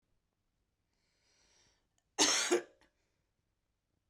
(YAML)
cough_length: 4.1 s
cough_amplitude: 7481
cough_signal_mean_std_ratio: 0.25
survey_phase: beta (2021-08-13 to 2022-03-07)
age: 45-64
gender: Female
wearing_mask: 'No'
symptom_change_to_sense_of_smell_or_taste: true
symptom_loss_of_taste: true
symptom_onset: 6 days
smoker_status: Never smoked
respiratory_condition_asthma: true
respiratory_condition_other: false
recruitment_source: Test and Trace
submission_delay: 2 days
covid_test_result: Positive
covid_test_method: RT-qPCR